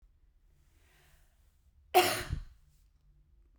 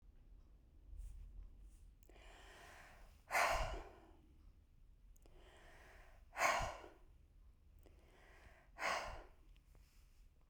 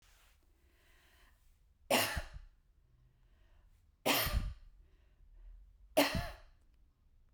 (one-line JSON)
{"cough_length": "3.6 s", "cough_amplitude": 10373, "cough_signal_mean_std_ratio": 0.25, "exhalation_length": "10.5 s", "exhalation_amplitude": 2983, "exhalation_signal_mean_std_ratio": 0.42, "three_cough_length": "7.3 s", "three_cough_amplitude": 6134, "three_cough_signal_mean_std_ratio": 0.34, "survey_phase": "beta (2021-08-13 to 2022-03-07)", "age": "45-64", "gender": "Female", "wearing_mask": "No", "symptom_none": true, "smoker_status": "Never smoked", "respiratory_condition_asthma": false, "respiratory_condition_other": false, "recruitment_source": "REACT", "submission_delay": "2 days", "covid_test_result": "Negative", "covid_test_method": "RT-qPCR", "influenza_a_test_result": "Negative", "influenza_b_test_result": "Negative"}